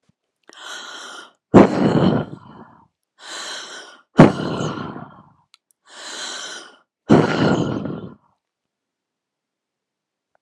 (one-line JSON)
{"exhalation_length": "10.4 s", "exhalation_amplitude": 32768, "exhalation_signal_mean_std_ratio": 0.34, "survey_phase": "alpha (2021-03-01 to 2021-08-12)", "age": "18-44", "gender": "Female", "wearing_mask": "No", "symptom_none": true, "smoker_status": "Never smoked", "respiratory_condition_asthma": true, "respiratory_condition_other": false, "recruitment_source": "REACT", "submission_delay": "1 day", "covid_test_result": "Negative", "covid_test_method": "RT-qPCR"}